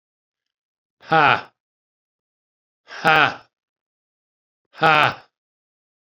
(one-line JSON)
{"exhalation_length": "6.1 s", "exhalation_amplitude": 31164, "exhalation_signal_mean_std_ratio": 0.27, "survey_phase": "beta (2021-08-13 to 2022-03-07)", "age": "65+", "gender": "Male", "wearing_mask": "No", "symptom_cough_any": true, "smoker_status": "Ex-smoker", "respiratory_condition_asthma": true, "respiratory_condition_other": true, "recruitment_source": "REACT", "submission_delay": "2 days", "covid_test_result": "Negative", "covid_test_method": "RT-qPCR"}